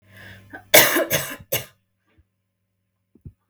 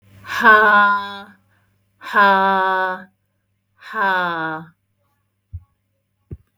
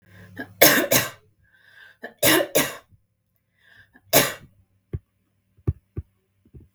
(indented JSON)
{
  "cough_length": "3.5 s",
  "cough_amplitude": 32768,
  "cough_signal_mean_std_ratio": 0.3,
  "exhalation_length": "6.6 s",
  "exhalation_amplitude": 32766,
  "exhalation_signal_mean_std_ratio": 0.48,
  "three_cough_length": "6.7 s",
  "three_cough_amplitude": 32768,
  "three_cough_signal_mean_std_ratio": 0.32,
  "survey_phase": "beta (2021-08-13 to 2022-03-07)",
  "age": "18-44",
  "gender": "Female",
  "wearing_mask": "No",
  "symptom_none": true,
  "smoker_status": "Never smoked",
  "respiratory_condition_asthma": false,
  "respiratory_condition_other": false,
  "recruitment_source": "REACT",
  "submission_delay": "2 days",
  "covid_test_result": "Negative",
  "covid_test_method": "RT-qPCR",
  "influenza_a_test_result": "Negative",
  "influenza_b_test_result": "Negative"
}